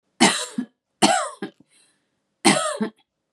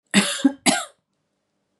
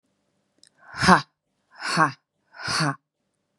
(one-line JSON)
{"three_cough_length": "3.3 s", "three_cough_amplitude": 29267, "three_cough_signal_mean_std_ratio": 0.4, "cough_length": "1.8 s", "cough_amplitude": 25301, "cough_signal_mean_std_ratio": 0.38, "exhalation_length": "3.6 s", "exhalation_amplitude": 32698, "exhalation_signal_mean_std_ratio": 0.32, "survey_phase": "beta (2021-08-13 to 2022-03-07)", "age": "18-44", "gender": "Female", "wearing_mask": "No", "symptom_cough_any": true, "symptom_runny_or_blocked_nose": true, "symptom_shortness_of_breath": true, "symptom_sore_throat": true, "symptom_diarrhoea": true, "symptom_fatigue": true, "symptom_headache": true, "symptom_change_to_sense_of_smell_or_taste": true, "symptom_onset": "4 days", "smoker_status": "Current smoker (e-cigarettes or vapes only)", "respiratory_condition_asthma": false, "respiratory_condition_other": false, "recruitment_source": "Test and Trace", "submission_delay": "1 day", "covid_test_result": "Positive", "covid_test_method": "RT-qPCR", "covid_ct_value": 21.8, "covid_ct_gene": "N gene"}